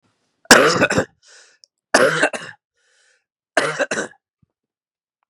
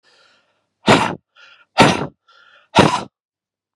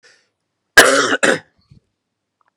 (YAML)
three_cough_length: 5.3 s
three_cough_amplitude: 32768
three_cough_signal_mean_std_ratio: 0.35
exhalation_length: 3.8 s
exhalation_amplitude: 32768
exhalation_signal_mean_std_ratio: 0.33
cough_length: 2.6 s
cough_amplitude: 32768
cough_signal_mean_std_ratio: 0.33
survey_phase: beta (2021-08-13 to 2022-03-07)
age: 45-64
gender: Male
wearing_mask: 'No'
symptom_cough_any: true
symptom_runny_or_blocked_nose: true
symptom_shortness_of_breath: true
symptom_sore_throat: true
symptom_fatigue: true
symptom_fever_high_temperature: true
symptom_headache: true
symptom_other: true
smoker_status: Ex-smoker
respiratory_condition_asthma: false
respiratory_condition_other: false
recruitment_source: Test and Trace
submission_delay: 2 days
covid_test_result: Positive
covid_test_method: RT-qPCR
covid_ct_value: 12.8
covid_ct_gene: N gene
covid_ct_mean: 13.5
covid_viral_load: 38000000 copies/ml
covid_viral_load_category: High viral load (>1M copies/ml)